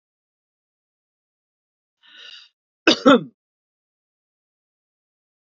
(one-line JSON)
{"cough_length": "5.5 s", "cough_amplitude": 29045, "cough_signal_mean_std_ratio": 0.16, "survey_phase": "beta (2021-08-13 to 2022-03-07)", "age": "18-44", "gender": "Male", "wearing_mask": "No", "symptom_none": true, "smoker_status": "Never smoked", "respiratory_condition_asthma": false, "respiratory_condition_other": false, "recruitment_source": "Test and Trace", "submission_delay": "0 days", "covid_test_result": "Negative", "covid_test_method": "LFT"}